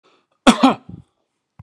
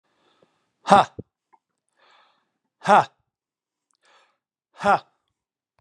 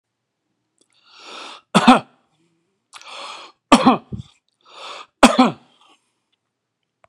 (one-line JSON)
{"cough_length": "1.6 s", "cough_amplitude": 32767, "cough_signal_mean_std_ratio": 0.28, "exhalation_length": "5.8 s", "exhalation_amplitude": 32496, "exhalation_signal_mean_std_ratio": 0.21, "three_cough_length": "7.1 s", "three_cough_amplitude": 32768, "three_cough_signal_mean_std_ratio": 0.26, "survey_phase": "beta (2021-08-13 to 2022-03-07)", "age": "65+", "gender": "Male", "wearing_mask": "No", "symptom_none": true, "smoker_status": "Ex-smoker", "respiratory_condition_asthma": true, "respiratory_condition_other": false, "recruitment_source": "REACT", "submission_delay": "0 days", "covid_test_result": "Negative", "covid_test_method": "RT-qPCR"}